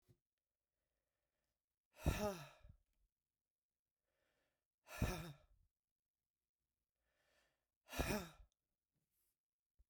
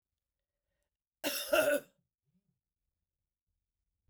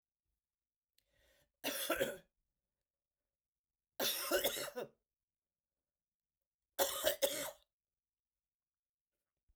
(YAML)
exhalation_length: 9.9 s
exhalation_amplitude: 1789
exhalation_signal_mean_std_ratio: 0.24
cough_length: 4.1 s
cough_amplitude: 5332
cough_signal_mean_std_ratio: 0.27
three_cough_length: 9.6 s
three_cough_amplitude: 3848
three_cough_signal_mean_std_ratio: 0.33
survey_phase: beta (2021-08-13 to 2022-03-07)
age: 65+
gender: Female
wearing_mask: 'No'
symptom_cough_any: true
symptom_runny_or_blocked_nose: true
symptom_change_to_sense_of_smell_or_taste: true
symptom_loss_of_taste: true
symptom_onset: 4 days
smoker_status: Never smoked
respiratory_condition_asthma: false
respiratory_condition_other: false
recruitment_source: Test and Trace
submission_delay: 3 days
covid_test_result: Positive
covid_test_method: RT-qPCR
covid_ct_value: 14.1
covid_ct_gene: ORF1ab gene
covid_ct_mean: 14.6
covid_viral_load: 16000000 copies/ml
covid_viral_load_category: High viral load (>1M copies/ml)